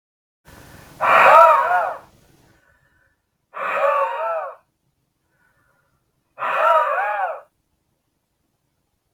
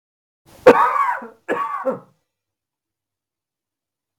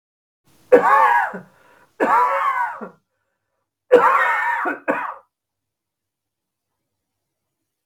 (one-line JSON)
{"exhalation_length": "9.1 s", "exhalation_amplitude": 32768, "exhalation_signal_mean_std_ratio": 0.41, "cough_length": "4.2 s", "cough_amplitude": 32768, "cough_signal_mean_std_ratio": 0.31, "three_cough_length": "7.9 s", "three_cough_amplitude": 32768, "three_cough_signal_mean_std_ratio": 0.43, "survey_phase": "beta (2021-08-13 to 2022-03-07)", "age": "45-64", "gender": "Male", "wearing_mask": "No", "symptom_none": true, "smoker_status": "Ex-smoker", "respiratory_condition_asthma": false, "respiratory_condition_other": false, "recruitment_source": "REACT", "submission_delay": "7 days", "covid_test_result": "Negative", "covid_test_method": "RT-qPCR", "influenza_a_test_result": "Negative", "influenza_b_test_result": "Negative"}